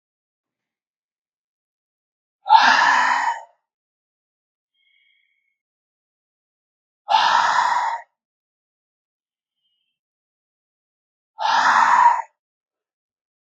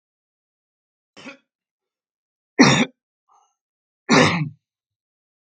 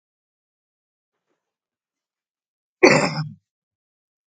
{"exhalation_length": "13.6 s", "exhalation_amplitude": 32558, "exhalation_signal_mean_std_ratio": 0.35, "three_cough_length": "5.5 s", "three_cough_amplitude": 32767, "three_cough_signal_mean_std_ratio": 0.26, "cough_length": "4.3 s", "cough_amplitude": 32767, "cough_signal_mean_std_ratio": 0.2, "survey_phase": "beta (2021-08-13 to 2022-03-07)", "age": "18-44", "gender": "Male", "wearing_mask": "No", "symptom_none": true, "smoker_status": "Never smoked", "respiratory_condition_asthma": false, "respiratory_condition_other": false, "recruitment_source": "REACT", "submission_delay": "1 day", "covid_test_result": "Negative", "covid_test_method": "RT-qPCR", "influenza_a_test_result": "Negative", "influenza_b_test_result": "Negative"}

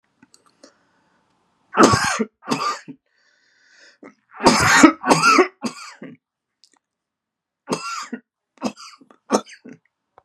{"three_cough_length": "10.2 s", "three_cough_amplitude": 32768, "three_cough_signal_mean_std_ratio": 0.34, "survey_phase": "beta (2021-08-13 to 2022-03-07)", "age": "45-64", "gender": "Male", "wearing_mask": "No", "symptom_none": true, "smoker_status": "Never smoked", "respiratory_condition_asthma": false, "respiratory_condition_other": false, "recruitment_source": "REACT", "submission_delay": "2 days", "covid_test_result": "Negative", "covid_test_method": "RT-qPCR", "influenza_a_test_result": "Unknown/Void", "influenza_b_test_result": "Unknown/Void"}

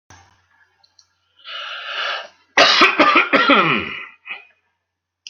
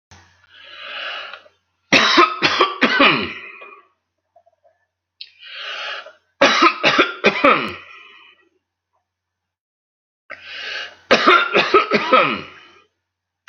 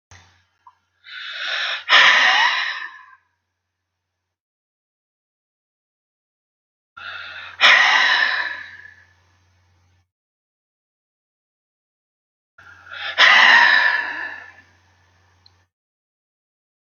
{"cough_length": "5.3 s", "cough_amplitude": 32213, "cough_signal_mean_std_ratio": 0.45, "three_cough_length": "13.5 s", "three_cough_amplitude": 32767, "three_cough_signal_mean_std_ratio": 0.43, "exhalation_length": "16.9 s", "exhalation_amplitude": 32767, "exhalation_signal_mean_std_ratio": 0.35, "survey_phase": "beta (2021-08-13 to 2022-03-07)", "age": "65+", "gender": "Male", "wearing_mask": "No", "symptom_abdominal_pain": true, "smoker_status": "Ex-smoker", "respiratory_condition_asthma": false, "respiratory_condition_other": false, "recruitment_source": "REACT", "submission_delay": "3 days", "covid_test_result": "Negative", "covid_test_method": "RT-qPCR"}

